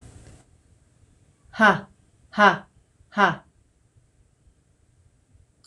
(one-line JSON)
{"exhalation_length": "5.7 s", "exhalation_amplitude": 25003, "exhalation_signal_mean_std_ratio": 0.25, "survey_phase": "beta (2021-08-13 to 2022-03-07)", "age": "45-64", "gender": "Female", "wearing_mask": "No", "symptom_none": true, "smoker_status": "Never smoked", "respiratory_condition_asthma": false, "respiratory_condition_other": false, "recruitment_source": "REACT", "submission_delay": "0 days", "covid_test_result": "Negative", "covid_test_method": "RT-qPCR"}